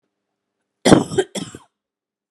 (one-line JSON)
{"cough_length": "2.3 s", "cough_amplitude": 32768, "cough_signal_mean_std_ratio": 0.26, "survey_phase": "beta (2021-08-13 to 2022-03-07)", "age": "45-64", "gender": "Female", "wearing_mask": "No", "symptom_cough_any": true, "smoker_status": "Never smoked", "respiratory_condition_asthma": false, "respiratory_condition_other": false, "recruitment_source": "REACT", "submission_delay": "1 day", "covid_test_result": "Negative", "covid_test_method": "RT-qPCR"}